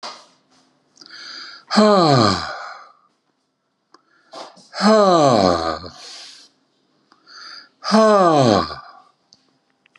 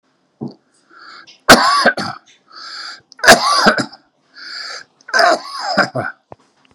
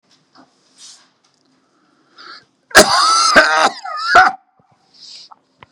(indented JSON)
{
  "exhalation_length": "10.0 s",
  "exhalation_amplitude": 29330,
  "exhalation_signal_mean_std_ratio": 0.43,
  "three_cough_length": "6.7 s",
  "three_cough_amplitude": 32768,
  "three_cough_signal_mean_std_ratio": 0.42,
  "cough_length": "5.7 s",
  "cough_amplitude": 32768,
  "cough_signal_mean_std_ratio": 0.39,
  "survey_phase": "beta (2021-08-13 to 2022-03-07)",
  "age": "65+",
  "gender": "Male",
  "wearing_mask": "No",
  "symptom_diarrhoea": true,
  "smoker_status": "Ex-smoker",
  "respiratory_condition_asthma": false,
  "respiratory_condition_other": false,
  "recruitment_source": "Test and Trace",
  "submission_delay": "3 days",
  "covid_test_result": "Positive",
  "covid_test_method": "RT-qPCR",
  "covid_ct_value": 24.4,
  "covid_ct_gene": "ORF1ab gene",
  "covid_ct_mean": 25.1,
  "covid_viral_load": "6100 copies/ml",
  "covid_viral_load_category": "Minimal viral load (< 10K copies/ml)"
}